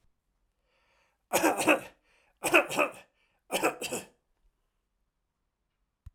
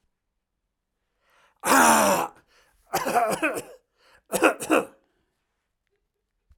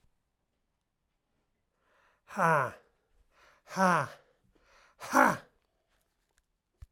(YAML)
three_cough_length: 6.1 s
three_cough_amplitude: 14900
three_cough_signal_mean_std_ratio: 0.32
cough_length: 6.6 s
cough_amplitude: 20455
cough_signal_mean_std_ratio: 0.38
exhalation_length: 6.9 s
exhalation_amplitude: 15241
exhalation_signal_mean_std_ratio: 0.27
survey_phase: alpha (2021-03-01 to 2021-08-12)
age: 65+
gender: Male
wearing_mask: 'No'
symptom_none: true
smoker_status: Never smoked
respiratory_condition_asthma: false
respiratory_condition_other: false
recruitment_source: REACT
submission_delay: 1 day
covid_test_result: Negative
covid_test_method: RT-qPCR